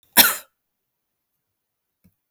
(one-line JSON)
{"cough_length": "2.3 s", "cough_amplitude": 32768, "cough_signal_mean_std_ratio": 0.19, "survey_phase": "beta (2021-08-13 to 2022-03-07)", "age": "45-64", "gender": "Female", "wearing_mask": "No", "symptom_none": true, "symptom_onset": "4 days", "smoker_status": "Ex-smoker", "respiratory_condition_asthma": false, "respiratory_condition_other": false, "recruitment_source": "REACT", "submission_delay": "1 day", "covid_test_result": "Negative", "covid_test_method": "RT-qPCR"}